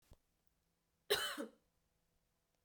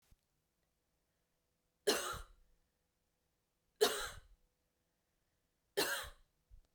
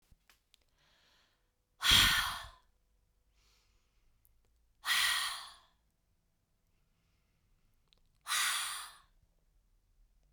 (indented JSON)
{
  "cough_length": "2.6 s",
  "cough_amplitude": 2887,
  "cough_signal_mean_std_ratio": 0.27,
  "three_cough_length": "6.7 s",
  "three_cough_amplitude": 4117,
  "three_cough_signal_mean_std_ratio": 0.27,
  "exhalation_length": "10.3 s",
  "exhalation_amplitude": 8532,
  "exhalation_signal_mean_std_ratio": 0.3,
  "survey_phase": "beta (2021-08-13 to 2022-03-07)",
  "age": "18-44",
  "gender": "Female",
  "wearing_mask": "No",
  "symptom_none": true,
  "symptom_onset": "13 days",
  "smoker_status": "Ex-smoker",
  "respiratory_condition_asthma": false,
  "respiratory_condition_other": false,
  "recruitment_source": "REACT",
  "submission_delay": "2 days",
  "covid_test_result": "Negative",
  "covid_test_method": "RT-qPCR"
}